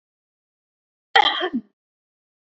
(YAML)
cough_length: 2.6 s
cough_amplitude: 27847
cough_signal_mean_std_ratio: 0.26
survey_phase: beta (2021-08-13 to 2022-03-07)
age: 18-44
gender: Female
wearing_mask: 'No'
symptom_none: true
smoker_status: Never smoked
respiratory_condition_asthma: false
respiratory_condition_other: false
recruitment_source: REACT
submission_delay: 2 days
covid_test_result: Negative
covid_test_method: RT-qPCR
influenza_a_test_result: Negative
influenza_b_test_result: Negative